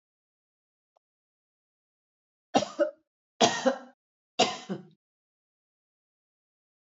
{"three_cough_length": "6.9 s", "three_cough_amplitude": 13951, "three_cough_signal_mean_std_ratio": 0.24, "survey_phase": "alpha (2021-03-01 to 2021-08-12)", "age": "45-64", "gender": "Female", "wearing_mask": "No", "symptom_none": true, "smoker_status": "Ex-smoker", "respiratory_condition_asthma": false, "respiratory_condition_other": false, "recruitment_source": "REACT", "submission_delay": "10 days", "covid_test_result": "Negative", "covid_test_method": "RT-qPCR"}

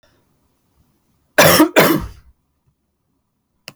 {"cough_length": "3.8 s", "cough_amplitude": 32768, "cough_signal_mean_std_ratio": 0.32, "survey_phase": "alpha (2021-03-01 to 2021-08-12)", "age": "18-44", "gender": "Female", "wearing_mask": "No", "symptom_fatigue": true, "symptom_fever_high_temperature": true, "symptom_headache": true, "smoker_status": "Never smoked", "respiratory_condition_asthma": false, "respiratory_condition_other": false, "recruitment_source": "Test and Trace", "submission_delay": "1 day", "covid_test_result": "Positive", "covid_test_method": "RT-qPCR", "covid_ct_value": 28.2, "covid_ct_gene": "ORF1ab gene", "covid_ct_mean": 29.0, "covid_viral_load": "300 copies/ml", "covid_viral_load_category": "Minimal viral load (< 10K copies/ml)"}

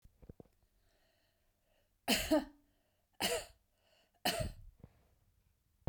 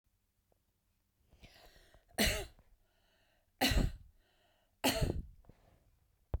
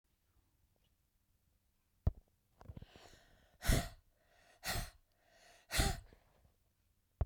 {"three_cough_length": "5.9 s", "three_cough_amplitude": 4730, "three_cough_signal_mean_std_ratio": 0.31, "cough_length": "6.4 s", "cough_amplitude": 4323, "cough_signal_mean_std_ratio": 0.33, "exhalation_length": "7.3 s", "exhalation_amplitude": 3974, "exhalation_signal_mean_std_ratio": 0.26, "survey_phase": "beta (2021-08-13 to 2022-03-07)", "age": "65+", "gender": "Female", "wearing_mask": "No", "symptom_none": true, "smoker_status": "Never smoked", "respiratory_condition_asthma": false, "respiratory_condition_other": false, "recruitment_source": "REACT", "submission_delay": "10 days", "covid_test_result": "Negative", "covid_test_method": "RT-qPCR", "influenza_a_test_result": "Negative", "influenza_b_test_result": "Negative"}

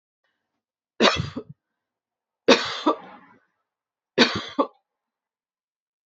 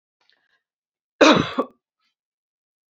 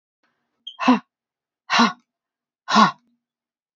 {"three_cough_length": "6.1 s", "three_cough_amplitude": 28360, "three_cough_signal_mean_std_ratio": 0.28, "cough_length": "2.9 s", "cough_amplitude": 28222, "cough_signal_mean_std_ratio": 0.24, "exhalation_length": "3.8 s", "exhalation_amplitude": 27329, "exhalation_signal_mean_std_ratio": 0.31, "survey_phase": "beta (2021-08-13 to 2022-03-07)", "age": "45-64", "gender": "Female", "wearing_mask": "No", "symptom_none": true, "smoker_status": "Ex-smoker", "respiratory_condition_asthma": false, "respiratory_condition_other": false, "recruitment_source": "REACT", "submission_delay": "2 days", "covid_test_result": "Negative", "covid_test_method": "RT-qPCR", "influenza_a_test_result": "Negative", "influenza_b_test_result": "Negative"}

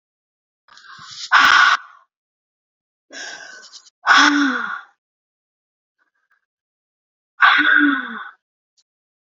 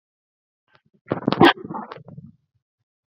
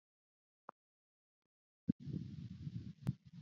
{"exhalation_length": "9.2 s", "exhalation_amplitude": 32768, "exhalation_signal_mean_std_ratio": 0.37, "cough_length": "3.1 s", "cough_amplitude": 28251, "cough_signal_mean_std_ratio": 0.24, "three_cough_length": "3.4 s", "three_cough_amplitude": 2791, "three_cough_signal_mean_std_ratio": 0.34, "survey_phase": "beta (2021-08-13 to 2022-03-07)", "age": "45-64", "gender": "Female", "wearing_mask": "No", "symptom_none": true, "smoker_status": "Never smoked", "respiratory_condition_asthma": false, "respiratory_condition_other": false, "recruitment_source": "REACT", "submission_delay": "2 days", "covid_test_result": "Negative", "covid_test_method": "RT-qPCR", "influenza_a_test_result": "Negative", "influenza_b_test_result": "Negative"}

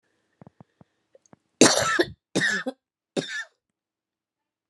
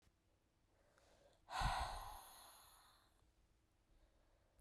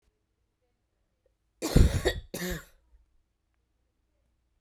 {"three_cough_length": "4.7 s", "three_cough_amplitude": 28564, "three_cough_signal_mean_std_ratio": 0.31, "exhalation_length": "4.6 s", "exhalation_amplitude": 1106, "exhalation_signal_mean_std_ratio": 0.36, "cough_length": "4.6 s", "cough_amplitude": 16340, "cough_signal_mean_std_ratio": 0.25, "survey_phase": "beta (2021-08-13 to 2022-03-07)", "age": "18-44", "gender": "Female", "wearing_mask": "No", "symptom_cough_any": true, "symptom_runny_or_blocked_nose": true, "symptom_abdominal_pain": true, "symptom_diarrhoea": true, "symptom_fatigue": true, "symptom_headache": true, "symptom_change_to_sense_of_smell_or_taste": true, "symptom_onset": "3 days", "smoker_status": "Current smoker (1 to 10 cigarettes per day)", "respiratory_condition_asthma": false, "respiratory_condition_other": false, "recruitment_source": "Test and Trace", "submission_delay": "2 days", "covid_test_result": "Positive", "covid_test_method": "RT-qPCR"}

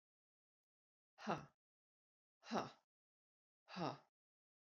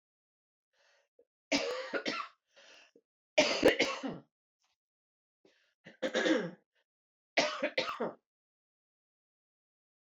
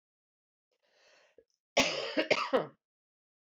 {"exhalation_length": "4.6 s", "exhalation_amplitude": 1508, "exhalation_signal_mean_std_ratio": 0.26, "three_cough_length": "10.2 s", "three_cough_amplitude": 7622, "three_cough_signal_mean_std_ratio": 0.34, "cough_length": "3.6 s", "cough_amplitude": 7722, "cough_signal_mean_std_ratio": 0.33, "survey_phase": "beta (2021-08-13 to 2022-03-07)", "age": "45-64", "gender": "Female", "wearing_mask": "No", "symptom_cough_any": true, "symptom_runny_or_blocked_nose": true, "symptom_shortness_of_breath": true, "symptom_sore_throat": true, "symptom_fatigue": true, "symptom_change_to_sense_of_smell_or_taste": true, "symptom_loss_of_taste": true, "symptom_other": true, "symptom_onset": "3 days", "smoker_status": "Never smoked", "respiratory_condition_asthma": true, "respiratory_condition_other": false, "recruitment_source": "Test and Trace", "submission_delay": "1 day", "covid_test_result": "Positive", "covid_test_method": "RT-qPCR", "covid_ct_value": 18.7, "covid_ct_gene": "S gene", "covid_ct_mean": 18.9, "covid_viral_load": "630000 copies/ml", "covid_viral_load_category": "Low viral load (10K-1M copies/ml)"}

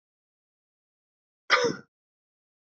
{"cough_length": "2.6 s", "cough_amplitude": 16484, "cough_signal_mean_std_ratio": 0.23, "survey_phase": "beta (2021-08-13 to 2022-03-07)", "age": "45-64", "gender": "Male", "wearing_mask": "No", "symptom_runny_or_blocked_nose": true, "symptom_fatigue": true, "symptom_headache": true, "symptom_change_to_sense_of_smell_or_taste": true, "symptom_onset": "3 days", "smoker_status": "Never smoked", "respiratory_condition_asthma": true, "respiratory_condition_other": false, "recruitment_source": "Test and Trace", "submission_delay": "2 days", "covid_test_result": "Positive", "covid_test_method": "ePCR"}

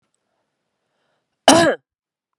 {"cough_length": "2.4 s", "cough_amplitude": 32768, "cough_signal_mean_std_ratio": 0.26, "survey_phase": "beta (2021-08-13 to 2022-03-07)", "age": "45-64", "gender": "Female", "wearing_mask": "Yes", "symptom_runny_or_blocked_nose": true, "symptom_sore_throat": true, "symptom_change_to_sense_of_smell_or_taste": true, "symptom_loss_of_taste": true, "symptom_onset": "2 days", "smoker_status": "Never smoked", "respiratory_condition_asthma": false, "respiratory_condition_other": false, "recruitment_source": "Test and Trace", "submission_delay": "1 day", "covid_test_result": "Positive", "covid_test_method": "RT-qPCR", "covid_ct_value": 15.3, "covid_ct_gene": "ORF1ab gene", "covid_ct_mean": 15.7, "covid_viral_load": "6900000 copies/ml", "covid_viral_load_category": "High viral load (>1M copies/ml)"}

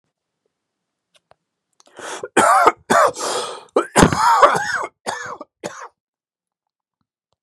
{"cough_length": "7.4 s", "cough_amplitude": 32768, "cough_signal_mean_std_ratio": 0.4, "survey_phase": "beta (2021-08-13 to 2022-03-07)", "age": "45-64", "gender": "Male", "wearing_mask": "No", "symptom_none": true, "smoker_status": "Ex-smoker", "respiratory_condition_asthma": false, "respiratory_condition_other": false, "recruitment_source": "REACT", "submission_delay": "1 day", "covid_test_result": "Negative", "covid_test_method": "RT-qPCR", "influenza_a_test_result": "Negative", "influenza_b_test_result": "Negative"}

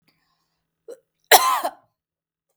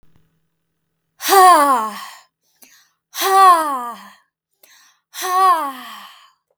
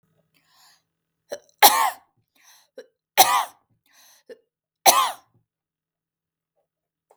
{"cough_length": "2.6 s", "cough_amplitude": 32768, "cough_signal_mean_std_ratio": 0.25, "exhalation_length": "6.6 s", "exhalation_amplitude": 32766, "exhalation_signal_mean_std_ratio": 0.44, "three_cough_length": "7.2 s", "three_cough_amplitude": 32768, "three_cough_signal_mean_std_ratio": 0.24, "survey_phase": "beta (2021-08-13 to 2022-03-07)", "age": "18-44", "gender": "Female", "wearing_mask": "No", "symptom_none": true, "smoker_status": "Never smoked", "respiratory_condition_asthma": false, "respiratory_condition_other": false, "recruitment_source": "REACT", "submission_delay": "0 days", "covid_test_result": "Negative", "covid_test_method": "RT-qPCR"}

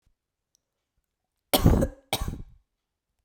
{"cough_length": "3.2 s", "cough_amplitude": 20557, "cough_signal_mean_std_ratio": 0.29, "survey_phase": "beta (2021-08-13 to 2022-03-07)", "age": "18-44", "gender": "Female", "wearing_mask": "No", "symptom_runny_or_blocked_nose": true, "smoker_status": "Never smoked", "respiratory_condition_asthma": false, "respiratory_condition_other": false, "recruitment_source": "REACT", "submission_delay": "5 days", "covid_test_result": "Negative", "covid_test_method": "RT-qPCR"}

